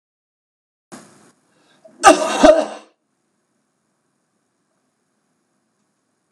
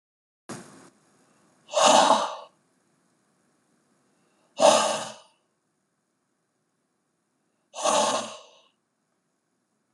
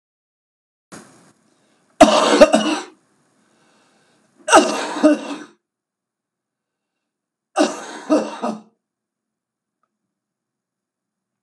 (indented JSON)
{
  "cough_length": "6.3 s",
  "cough_amplitude": 32768,
  "cough_signal_mean_std_ratio": 0.22,
  "exhalation_length": "9.9 s",
  "exhalation_amplitude": 21839,
  "exhalation_signal_mean_std_ratio": 0.3,
  "three_cough_length": "11.4 s",
  "three_cough_amplitude": 32768,
  "three_cough_signal_mean_std_ratio": 0.29,
  "survey_phase": "beta (2021-08-13 to 2022-03-07)",
  "age": "65+",
  "gender": "Male",
  "wearing_mask": "No",
  "symptom_cough_any": true,
  "symptom_new_continuous_cough": true,
  "symptom_runny_or_blocked_nose": true,
  "symptom_shortness_of_breath": true,
  "symptom_sore_throat": true,
  "symptom_diarrhoea": true,
  "symptom_fatigue": true,
  "symptom_fever_high_temperature": true,
  "symptom_headache": true,
  "symptom_change_to_sense_of_smell_or_taste": true,
  "symptom_loss_of_taste": true,
  "symptom_onset": "4 days",
  "smoker_status": "Never smoked",
  "respiratory_condition_asthma": false,
  "respiratory_condition_other": false,
  "recruitment_source": "Test and Trace",
  "submission_delay": "1 day",
  "covid_test_result": "Positive",
  "covid_test_method": "ePCR"
}